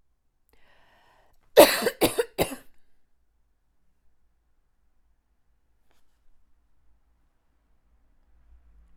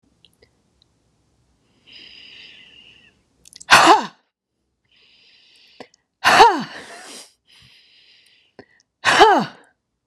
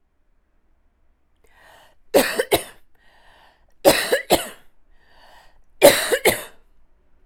{"cough_length": "9.0 s", "cough_amplitude": 32768, "cough_signal_mean_std_ratio": 0.18, "exhalation_length": "10.1 s", "exhalation_amplitude": 32768, "exhalation_signal_mean_std_ratio": 0.27, "three_cough_length": "7.3 s", "three_cough_amplitude": 32768, "three_cough_signal_mean_std_ratio": 0.31, "survey_phase": "alpha (2021-03-01 to 2021-08-12)", "age": "45-64", "gender": "Female", "wearing_mask": "No", "symptom_none": true, "smoker_status": "Ex-smoker", "respiratory_condition_asthma": false, "respiratory_condition_other": true, "recruitment_source": "REACT", "submission_delay": "2 days", "covid_test_result": "Negative", "covid_test_method": "RT-qPCR"}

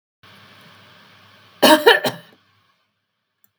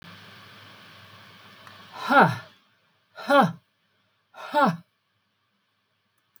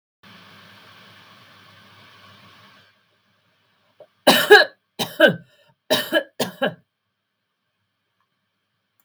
{"cough_length": "3.6 s", "cough_amplitude": 32768, "cough_signal_mean_std_ratio": 0.27, "exhalation_length": "6.4 s", "exhalation_amplitude": 24653, "exhalation_signal_mean_std_ratio": 0.3, "three_cough_length": "9.0 s", "three_cough_amplitude": 32768, "three_cough_signal_mean_std_ratio": 0.24, "survey_phase": "beta (2021-08-13 to 2022-03-07)", "age": "65+", "gender": "Female", "wearing_mask": "No", "symptom_none": true, "smoker_status": "Ex-smoker", "respiratory_condition_asthma": false, "respiratory_condition_other": false, "recruitment_source": "REACT", "submission_delay": "2 days", "covid_test_result": "Negative", "covid_test_method": "RT-qPCR", "influenza_a_test_result": "Negative", "influenza_b_test_result": "Negative"}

